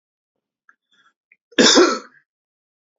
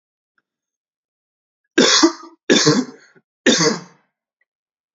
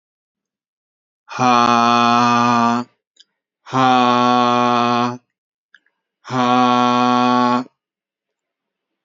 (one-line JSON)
{"cough_length": "3.0 s", "cough_amplitude": 32238, "cough_signal_mean_std_ratio": 0.29, "three_cough_length": "4.9 s", "three_cough_amplitude": 30778, "three_cough_signal_mean_std_ratio": 0.36, "exhalation_length": "9.0 s", "exhalation_amplitude": 29297, "exhalation_signal_mean_std_ratio": 0.54, "survey_phase": "beta (2021-08-13 to 2022-03-07)", "age": "18-44", "gender": "Male", "wearing_mask": "No", "symptom_none": true, "smoker_status": "Never smoked", "respiratory_condition_asthma": false, "respiratory_condition_other": false, "recruitment_source": "Test and Trace", "submission_delay": "2 days", "covid_test_result": "Negative", "covid_test_method": "ePCR"}